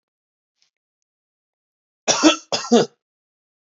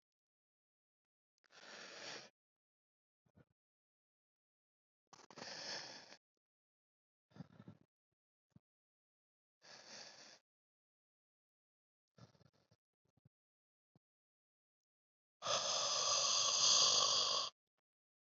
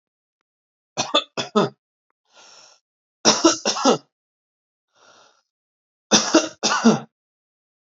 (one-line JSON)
{"cough_length": "3.7 s", "cough_amplitude": 28566, "cough_signal_mean_std_ratio": 0.27, "exhalation_length": "18.3 s", "exhalation_amplitude": 3388, "exhalation_signal_mean_std_ratio": 0.3, "three_cough_length": "7.9 s", "three_cough_amplitude": 32154, "three_cough_signal_mean_std_ratio": 0.33, "survey_phase": "beta (2021-08-13 to 2022-03-07)", "age": "18-44", "gender": "Male", "wearing_mask": "No", "symptom_none": true, "smoker_status": "Never smoked", "respiratory_condition_asthma": false, "respiratory_condition_other": false, "recruitment_source": "REACT", "submission_delay": "2 days", "covid_test_result": "Negative", "covid_test_method": "RT-qPCR", "influenza_a_test_result": "Negative", "influenza_b_test_result": "Negative"}